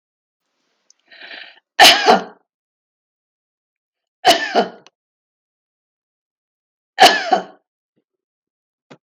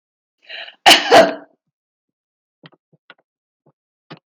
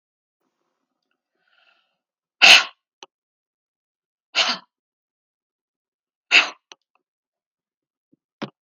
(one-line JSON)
{"three_cough_length": "9.0 s", "three_cough_amplitude": 32768, "three_cough_signal_mean_std_ratio": 0.26, "cough_length": "4.3 s", "cough_amplitude": 32768, "cough_signal_mean_std_ratio": 0.25, "exhalation_length": "8.6 s", "exhalation_amplitude": 32768, "exhalation_signal_mean_std_ratio": 0.18, "survey_phase": "beta (2021-08-13 to 2022-03-07)", "age": "65+", "gender": "Female", "wearing_mask": "No", "symptom_none": true, "smoker_status": "Ex-smoker", "respiratory_condition_asthma": false, "respiratory_condition_other": false, "recruitment_source": "REACT", "submission_delay": "2 days", "covid_test_result": "Negative", "covid_test_method": "RT-qPCR"}